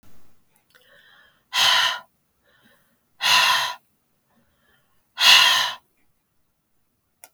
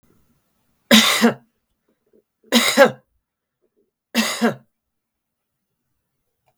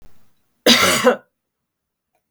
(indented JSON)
{
  "exhalation_length": "7.3 s",
  "exhalation_amplitude": 32768,
  "exhalation_signal_mean_std_ratio": 0.36,
  "three_cough_length": "6.6 s",
  "three_cough_amplitude": 32768,
  "three_cough_signal_mean_std_ratio": 0.3,
  "cough_length": "2.3 s",
  "cough_amplitude": 32768,
  "cough_signal_mean_std_ratio": 0.37,
  "survey_phase": "beta (2021-08-13 to 2022-03-07)",
  "age": "65+",
  "gender": "Female",
  "wearing_mask": "No",
  "symptom_none": true,
  "smoker_status": "Never smoked",
  "respiratory_condition_asthma": false,
  "respiratory_condition_other": false,
  "recruitment_source": "REACT",
  "submission_delay": "1 day",
  "covid_test_result": "Negative",
  "covid_test_method": "RT-qPCR",
  "influenza_a_test_result": "Negative",
  "influenza_b_test_result": "Negative"
}